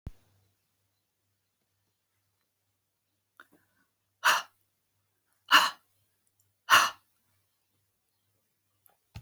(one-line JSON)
{"exhalation_length": "9.2 s", "exhalation_amplitude": 18280, "exhalation_signal_mean_std_ratio": 0.19, "survey_phase": "alpha (2021-03-01 to 2021-08-12)", "age": "65+", "gender": "Female", "wearing_mask": "No", "symptom_none": true, "smoker_status": "Ex-smoker", "respiratory_condition_asthma": false, "respiratory_condition_other": false, "recruitment_source": "REACT", "submission_delay": "1 day", "covid_test_result": "Negative", "covid_test_method": "RT-qPCR"}